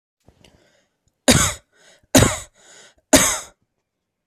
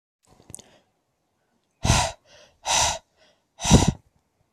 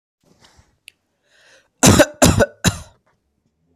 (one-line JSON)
{"three_cough_length": "4.3 s", "three_cough_amplitude": 32768, "three_cough_signal_mean_std_ratio": 0.31, "exhalation_length": "4.5 s", "exhalation_amplitude": 24527, "exhalation_signal_mean_std_ratio": 0.32, "cough_length": "3.8 s", "cough_amplitude": 32768, "cough_signal_mean_std_ratio": 0.31, "survey_phase": "alpha (2021-03-01 to 2021-08-12)", "age": "18-44", "gender": "Male", "wearing_mask": "No", "symptom_none": true, "smoker_status": "Never smoked", "respiratory_condition_asthma": false, "respiratory_condition_other": false, "recruitment_source": "REACT", "submission_delay": "1 day", "covid_test_result": "Negative", "covid_test_method": "RT-qPCR"}